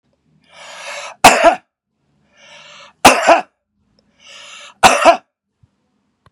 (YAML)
three_cough_length: 6.3 s
three_cough_amplitude: 32768
three_cough_signal_mean_std_ratio: 0.32
survey_phase: beta (2021-08-13 to 2022-03-07)
age: 65+
gender: Male
wearing_mask: 'No'
symptom_none: true
smoker_status: Never smoked
respiratory_condition_asthma: false
respiratory_condition_other: false
recruitment_source: REACT
submission_delay: 1 day
covid_test_result: Negative
covid_test_method: RT-qPCR
influenza_a_test_result: Negative
influenza_b_test_result: Negative